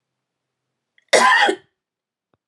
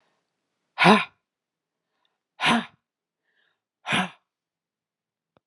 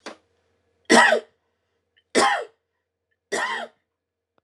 {"cough_length": "2.5 s", "cough_amplitude": 29399, "cough_signal_mean_std_ratio": 0.34, "exhalation_length": "5.5 s", "exhalation_amplitude": 24674, "exhalation_signal_mean_std_ratio": 0.25, "three_cough_length": "4.4 s", "three_cough_amplitude": 27943, "three_cough_signal_mean_std_ratio": 0.33, "survey_phase": "beta (2021-08-13 to 2022-03-07)", "age": "45-64", "gender": "Female", "wearing_mask": "No", "symptom_none": true, "smoker_status": "Never smoked", "respiratory_condition_asthma": false, "respiratory_condition_other": false, "recruitment_source": "REACT", "submission_delay": "3 days", "covid_test_result": "Negative", "covid_test_method": "RT-qPCR", "influenza_a_test_result": "Negative", "influenza_b_test_result": "Negative"}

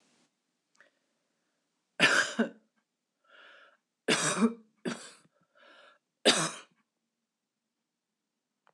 {"three_cough_length": "8.7 s", "three_cough_amplitude": 11974, "three_cough_signal_mean_std_ratio": 0.29, "survey_phase": "beta (2021-08-13 to 2022-03-07)", "age": "65+", "gender": "Female", "wearing_mask": "No", "symptom_abdominal_pain": true, "symptom_diarrhoea": true, "symptom_fatigue": true, "smoker_status": "Ex-smoker", "respiratory_condition_asthma": false, "respiratory_condition_other": false, "recruitment_source": "REACT", "submission_delay": "2 days", "covid_test_result": "Negative", "covid_test_method": "RT-qPCR", "influenza_a_test_result": "Negative", "influenza_b_test_result": "Negative"}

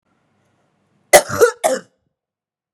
{"cough_length": "2.7 s", "cough_amplitude": 32768, "cough_signal_mean_std_ratio": 0.28, "survey_phase": "beta (2021-08-13 to 2022-03-07)", "age": "18-44", "gender": "Female", "wearing_mask": "No", "symptom_cough_any": true, "symptom_new_continuous_cough": true, "symptom_runny_or_blocked_nose": true, "symptom_fatigue": true, "symptom_headache": true, "symptom_onset": "4 days", "smoker_status": "Never smoked", "respiratory_condition_asthma": false, "respiratory_condition_other": false, "recruitment_source": "Test and Trace", "submission_delay": "3 days", "covid_test_result": "Positive", "covid_test_method": "RT-qPCR"}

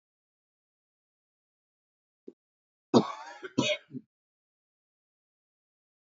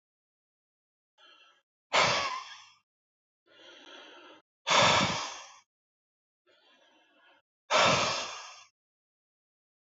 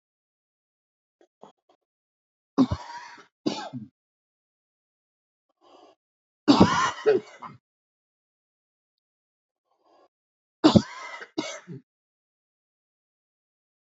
{"cough_length": "6.1 s", "cough_amplitude": 13231, "cough_signal_mean_std_ratio": 0.18, "exhalation_length": "9.9 s", "exhalation_amplitude": 10654, "exhalation_signal_mean_std_ratio": 0.34, "three_cough_length": "13.9 s", "three_cough_amplitude": 26428, "three_cough_signal_mean_std_ratio": 0.22, "survey_phase": "beta (2021-08-13 to 2022-03-07)", "age": "18-44", "gender": "Male", "wearing_mask": "No", "symptom_runny_or_blocked_nose": true, "smoker_status": "Never smoked", "respiratory_condition_asthma": false, "respiratory_condition_other": false, "recruitment_source": "REACT", "submission_delay": "1 day", "covid_test_result": "Negative", "covid_test_method": "RT-qPCR", "influenza_a_test_result": "Negative", "influenza_b_test_result": "Negative"}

